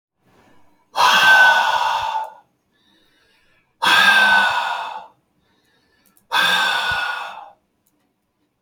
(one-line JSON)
{"exhalation_length": "8.6 s", "exhalation_amplitude": 27355, "exhalation_signal_mean_std_ratio": 0.52, "survey_phase": "beta (2021-08-13 to 2022-03-07)", "age": "18-44", "gender": "Male", "wearing_mask": "No", "symptom_none": true, "smoker_status": "Never smoked", "respiratory_condition_asthma": false, "respiratory_condition_other": false, "recruitment_source": "REACT", "submission_delay": "1 day", "covid_test_result": "Negative", "covid_test_method": "RT-qPCR"}